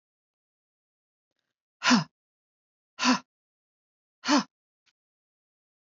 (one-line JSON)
{"exhalation_length": "5.8 s", "exhalation_amplitude": 14036, "exhalation_signal_mean_std_ratio": 0.23, "survey_phase": "beta (2021-08-13 to 2022-03-07)", "age": "45-64", "gender": "Female", "wearing_mask": "No", "symptom_none": true, "smoker_status": "Never smoked", "respiratory_condition_asthma": false, "respiratory_condition_other": false, "recruitment_source": "REACT", "submission_delay": "2 days", "covid_test_result": "Negative", "covid_test_method": "RT-qPCR", "influenza_a_test_result": "Negative", "influenza_b_test_result": "Negative"}